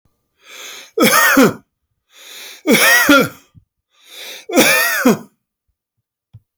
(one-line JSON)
{"three_cough_length": "6.6 s", "three_cough_amplitude": 32768, "three_cough_signal_mean_std_ratio": 0.47, "survey_phase": "beta (2021-08-13 to 2022-03-07)", "age": "45-64", "gender": "Male", "wearing_mask": "No", "symptom_runny_or_blocked_nose": true, "smoker_status": "Never smoked", "respiratory_condition_asthma": false, "respiratory_condition_other": false, "recruitment_source": "REACT", "submission_delay": "1 day", "covid_test_result": "Negative", "covid_test_method": "RT-qPCR"}